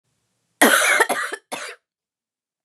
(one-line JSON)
{"cough_length": "2.6 s", "cough_amplitude": 28417, "cough_signal_mean_std_ratio": 0.41, "survey_phase": "beta (2021-08-13 to 2022-03-07)", "age": "18-44", "gender": "Female", "wearing_mask": "No", "symptom_cough_any": true, "symptom_runny_or_blocked_nose": true, "symptom_sore_throat": true, "symptom_fatigue": true, "symptom_headache": true, "smoker_status": "Never smoked", "respiratory_condition_asthma": true, "respiratory_condition_other": false, "recruitment_source": "Test and Trace", "submission_delay": "2 days", "covid_test_result": "Positive", "covid_test_method": "RT-qPCR", "covid_ct_value": 31.0, "covid_ct_gene": "ORF1ab gene"}